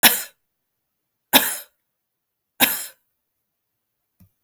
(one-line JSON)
{"three_cough_length": "4.4 s", "three_cough_amplitude": 32768, "three_cough_signal_mean_std_ratio": 0.24, "survey_phase": "beta (2021-08-13 to 2022-03-07)", "age": "45-64", "gender": "Female", "wearing_mask": "No", "symptom_none": true, "symptom_onset": "4 days", "smoker_status": "Ex-smoker", "respiratory_condition_asthma": false, "respiratory_condition_other": false, "recruitment_source": "REACT", "submission_delay": "1 day", "covid_test_result": "Negative", "covid_test_method": "RT-qPCR"}